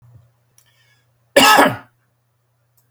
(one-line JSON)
{"cough_length": "2.9 s", "cough_amplitude": 32768, "cough_signal_mean_std_ratio": 0.29, "survey_phase": "beta (2021-08-13 to 2022-03-07)", "age": "45-64", "gender": "Male", "wearing_mask": "No", "symptom_none": true, "smoker_status": "Never smoked", "respiratory_condition_asthma": false, "respiratory_condition_other": false, "recruitment_source": "REACT", "submission_delay": "1 day", "covid_test_result": "Negative", "covid_test_method": "RT-qPCR", "influenza_a_test_result": "Negative", "influenza_b_test_result": "Negative"}